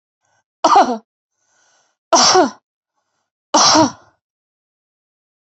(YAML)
three_cough_length: 5.5 s
three_cough_amplitude: 32768
three_cough_signal_mean_std_ratio: 0.36
survey_phase: beta (2021-08-13 to 2022-03-07)
age: 45-64
gender: Female
wearing_mask: 'No'
symptom_none: true
smoker_status: Never smoked
respiratory_condition_asthma: true
respiratory_condition_other: false
recruitment_source: REACT
submission_delay: 2 days
covid_test_result: Negative
covid_test_method: RT-qPCR